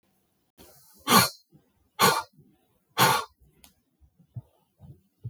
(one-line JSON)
{"exhalation_length": "5.3 s", "exhalation_amplitude": 20463, "exhalation_signal_mean_std_ratio": 0.29, "survey_phase": "beta (2021-08-13 to 2022-03-07)", "age": "45-64", "gender": "Male", "wearing_mask": "No", "symptom_cough_any": true, "symptom_new_continuous_cough": true, "symptom_change_to_sense_of_smell_or_taste": true, "symptom_onset": "8 days", "smoker_status": "Never smoked", "respiratory_condition_asthma": false, "respiratory_condition_other": false, "recruitment_source": "Test and Trace", "submission_delay": "3 days", "covid_test_result": "Positive", "covid_test_method": "RT-qPCR", "covid_ct_value": 20.2, "covid_ct_gene": "ORF1ab gene"}